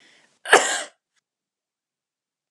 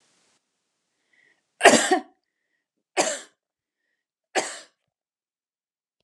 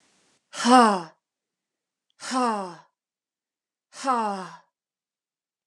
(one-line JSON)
{"cough_length": "2.5 s", "cough_amplitude": 32768, "cough_signal_mean_std_ratio": 0.23, "three_cough_length": "6.0 s", "three_cough_amplitude": 32767, "three_cough_signal_mean_std_ratio": 0.22, "exhalation_length": "5.7 s", "exhalation_amplitude": 25865, "exhalation_signal_mean_std_ratio": 0.31, "survey_phase": "beta (2021-08-13 to 2022-03-07)", "age": "45-64", "gender": "Female", "wearing_mask": "No", "symptom_none": true, "smoker_status": "Ex-smoker", "respiratory_condition_asthma": false, "respiratory_condition_other": false, "recruitment_source": "REACT", "submission_delay": "0 days", "covid_test_result": "Negative", "covid_test_method": "RT-qPCR", "influenza_a_test_result": "Negative", "influenza_b_test_result": "Negative"}